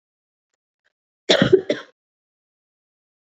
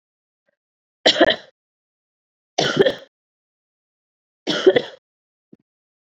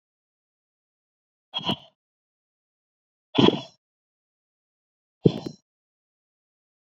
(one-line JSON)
{"cough_length": "3.2 s", "cough_amplitude": 27278, "cough_signal_mean_std_ratio": 0.24, "three_cough_length": "6.1 s", "three_cough_amplitude": 30203, "three_cough_signal_mean_std_ratio": 0.27, "exhalation_length": "6.8 s", "exhalation_amplitude": 26340, "exhalation_signal_mean_std_ratio": 0.17, "survey_phase": "beta (2021-08-13 to 2022-03-07)", "age": "18-44", "gender": "Female", "wearing_mask": "No", "symptom_cough_any": true, "symptom_runny_or_blocked_nose": true, "symptom_shortness_of_breath": true, "symptom_sore_throat": true, "symptom_fatigue": true, "symptom_headache": true, "smoker_status": "Ex-smoker", "respiratory_condition_asthma": false, "respiratory_condition_other": false, "recruitment_source": "Test and Trace", "submission_delay": "1 day", "covid_test_result": "Positive", "covid_test_method": "RT-qPCR"}